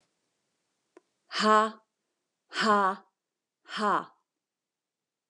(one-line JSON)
{"exhalation_length": "5.3 s", "exhalation_amplitude": 12309, "exhalation_signal_mean_std_ratio": 0.33, "survey_phase": "beta (2021-08-13 to 2022-03-07)", "age": "45-64", "gender": "Female", "wearing_mask": "No", "symptom_none": true, "smoker_status": "Never smoked", "respiratory_condition_asthma": false, "respiratory_condition_other": false, "recruitment_source": "REACT", "submission_delay": "2 days", "covid_test_result": "Negative", "covid_test_method": "RT-qPCR", "influenza_a_test_result": "Negative", "influenza_b_test_result": "Negative"}